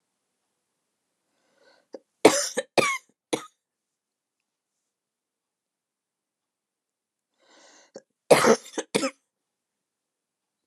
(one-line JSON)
{"cough_length": "10.7 s", "cough_amplitude": 30275, "cough_signal_mean_std_ratio": 0.2, "survey_phase": "alpha (2021-03-01 to 2021-08-12)", "age": "18-44", "gender": "Female", "wearing_mask": "No", "symptom_none": true, "smoker_status": "Never smoked", "respiratory_condition_asthma": false, "respiratory_condition_other": false, "recruitment_source": "REACT", "submission_delay": "6 days", "covid_test_result": "Negative", "covid_test_method": "RT-qPCR"}